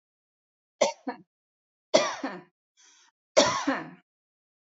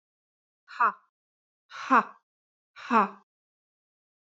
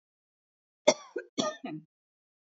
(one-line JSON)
{"three_cough_length": "4.6 s", "three_cough_amplitude": 18886, "three_cough_signal_mean_std_ratio": 0.31, "exhalation_length": "4.3 s", "exhalation_amplitude": 13712, "exhalation_signal_mean_std_ratio": 0.26, "cough_length": "2.5 s", "cough_amplitude": 16437, "cough_signal_mean_std_ratio": 0.24, "survey_phase": "beta (2021-08-13 to 2022-03-07)", "age": "45-64", "gender": "Female", "wearing_mask": "No", "symptom_none": true, "smoker_status": "Ex-smoker", "respiratory_condition_asthma": false, "respiratory_condition_other": false, "recruitment_source": "REACT", "submission_delay": "1 day", "covid_test_result": "Negative", "covid_test_method": "RT-qPCR"}